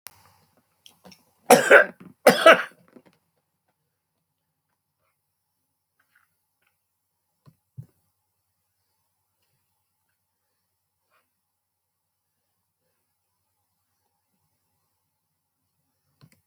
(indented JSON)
{
  "cough_length": "16.5 s",
  "cough_amplitude": 28702,
  "cough_signal_mean_std_ratio": 0.14,
  "survey_phase": "alpha (2021-03-01 to 2021-08-12)",
  "age": "65+",
  "gender": "Male",
  "wearing_mask": "No",
  "symptom_none": true,
  "smoker_status": "Ex-smoker",
  "respiratory_condition_asthma": false,
  "respiratory_condition_other": false,
  "recruitment_source": "REACT",
  "submission_delay": "3 days",
  "covid_test_result": "Negative",
  "covid_test_method": "RT-qPCR"
}